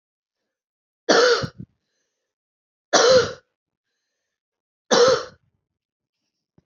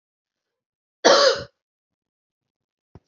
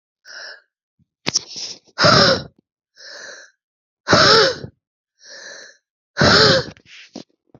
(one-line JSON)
{"three_cough_length": "6.7 s", "three_cough_amplitude": 26262, "three_cough_signal_mean_std_ratio": 0.32, "cough_length": "3.1 s", "cough_amplitude": 28027, "cough_signal_mean_std_ratio": 0.26, "exhalation_length": "7.6 s", "exhalation_amplitude": 31490, "exhalation_signal_mean_std_ratio": 0.39, "survey_phase": "beta (2021-08-13 to 2022-03-07)", "age": "45-64", "gender": "Female", "wearing_mask": "No", "symptom_other": true, "smoker_status": "Never smoked", "respiratory_condition_asthma": true, "respiratory_condition_other": false, "recruitment_source": "Test and Trace", "submission_delay": "2 days", "covid_test_result": "Positive", "covid_test_method": "RT-qPCR", "covid_ct_value": 27.5, "covid_ct_gene": "ORF1ab gene"}